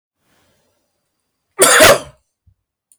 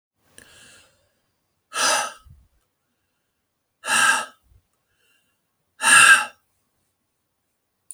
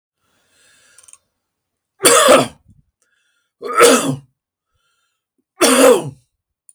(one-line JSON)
{"cough_length": "3.0 s", "cough_amplitude": 32768, "cough_signal_mean_std_ratio": 0.31, "exhalation_length": "7.9 s", "exhalation_amplitude": 32768, "exhalation_signal_mean_std_ratio": 0.28, "three_cough_length": "6.7 s", "three_cough_amplitude": 32768, "three_cough_signal_mean_std_ratio": 0.36, "survey_phase": "beta (2021-08-13 to 2022-03-07)", "age": "65+", "gender": "Male", "wearing_mask": "No", "symptom_none": true, "smoker_status": "Ex-smoker", "respiratory_condition_asthma": false, "respiratory_condition_other": false, "recruitment_source": "REACT", "submission_delay": "3 days", "covid_test_result": "Negative", "covid_test_method": "RT-qPCR"}